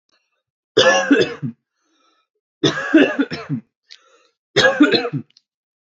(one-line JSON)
{"three_cough_length": "5.8 s", "three_cough_amplitude": 29098, "three_cough_signal_mean_std_ratio": 0.43, "survey_phase": "alpha (2021-03-01 to 2021-08-12)", "age": "18-44", "gender": "Male", "wearing_mask": "No", "symptom_none": true, "smoker_status": "Never smoked", "respiratory_condition_asthma": false, "respiratory_condition_other": false, "recruitment_source": "REACT", "submission_delay": "5 days", "covid_test_result": "Negative", "covid_test_method": "RT-qPCR"}